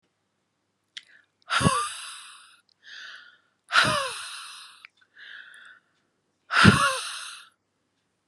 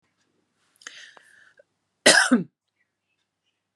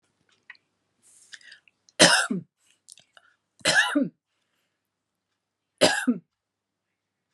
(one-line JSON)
{"exhalation_length": "8.3 s", "exhalation_amplitude": 31082, "exhalation_signal_mean_std_ratio": 0.33, "cough_length": "3.8 s", "cough_amplitude": 29833, "cough_signal_mean_std_ratio": 0.23, "three_cough_length": "7.3 s", "three_cough_amplitude": 28359, "three_cough_signal_mean_std_ratio": 0.28, "survey_phase": "beta (2021-08-13 to 2022-03-07)", "age": "45-64", "gender": "Female", "wearing_mask": "No", "symptom_fatigue": true, "smoker_status": "Never smoked", "respiratory_condition_asthma": false, "respiratory_condition_other": false, "recruitment_source": "REACT", "submission_delay": "2 days", "covid_test_result": "Negative", "covid_test_method": "RT-qPCR"}